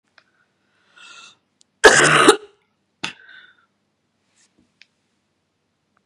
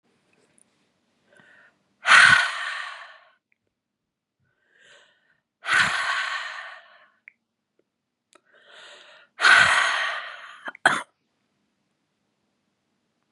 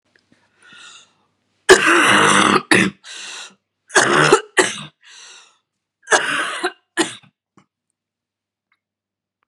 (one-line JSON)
{"cough_length": "6.1 s", "cough_amplitude": 32768, "cough_signal_mean_std_ratio": 0.23, "exhalation_length": "13.3 s", "exhalation_amplitude": 27635, "exhalation_signal_mean_std_ratio": 0.31, "three_cough_length": "9.5 s", "three_cough_amplitude": 32768, "three_cough_signal_mean_std_ratio": 0.39, "survey_phase": "beta (2021-08-13 to 2022-03-07)", "age": "45-64", "gender": "Female", "wearing_mask": "No", "symptom_cough_any": true, "symptom_runny_or_blocked_nose": true, "symptom_sore_throat": true, "symptom_fatigue": true, "symptom_headache": true, "symptom_onset": "2 days", "smoker_status": "Never smoked", "respiratory_condition_asthma": false, "respiratory_condition_other": false, "recruitment_source": "Test and Trace", "submission_delay": "2 days", "covid_test_result": "Positive", "covid_test_method": "RT-qPCR", "covid_ct_value": 22.3, "covid_ct_gene": "N gene"}